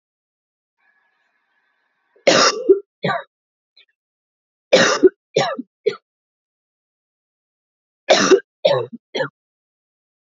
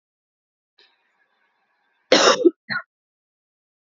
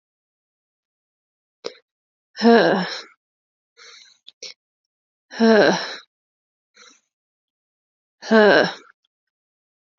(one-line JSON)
{"three_cough_length": "10.3 s", "three_cough_amplitude": 30650, "three_cough_signal_mean_std_ratio": 0.31, "cough_length": "3.8 s", "cough_amplitude": 27067, "cough_signal_mean_std_ratio": 0.25, "exhalation_length": "10.0 s", "exhalation_amplitude": 27997, "exhalation_signal_mean_std_ratio": 0.28, "survey_phase": "alpha (2021-03-01 to 2021-08-12)", "age": "18-44", "gender": "Female", "wearing_mask": "No", "symptom_cough_any": true, "symptom_headache": true, "smoker_status": "Never smoked", "respiratory_condition_asthma": false, "respiratory_condition_other": false, "recruitment_source": "Test and Trace", "submission_delay": "2 days", "covid_test_result": "Positive", "covid_test_method": "RT-qPCR"}